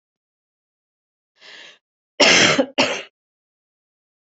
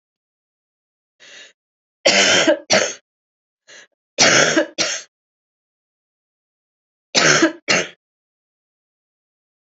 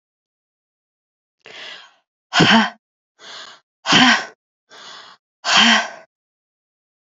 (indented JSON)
{
  "cough_length": "4.3 s",
  "cough_amplitude": 32249,
  "cough_signal_mean_std_ratio": 0.31,
  "three_cough_length": "9.7 s",
  "three_cough_amplitude": 31656,
  "three_cough_signal_mean_std_ratio": 0.35,
  "exhalation_length": "7.1 s",
  "exhalation_amplitude": 32270,
  "exhalation_signal_mean_std_ratio": 0.34,
  "survey_phase": "beta (2021-08-13 to 2022-03-07)",
  "age": "45-64",
  "gender": "Female",
  "wearing_mask": "No",
  "symptom_cough_any": true,
  "symptom_abdominal_pain": true,
  "symptom_fatigue": true,
  "symptom_fever_high_temperature": true,
  "symptom_other": true,
  "smoker_status": "Never smoked",
  "respiratory_condition_asthma": false,
  "respiratory_condition_other": false,
  "recruitment_source": "Test and Trace",
  "submission_delay": "1 day",
  "covid_test_result": "Positive",
  "covid_test_method": "RT-qPCR",
  "covid_ct_value": 20.9,
  "covid_ct_gene": "ORF1ab gene",
  "covid_ct_mean": 23.7,
  "covid_viral_load": "17000 copies/ml",
  "covid_viral_load_category": "Low viral load (10K-1M copies/ml)"
}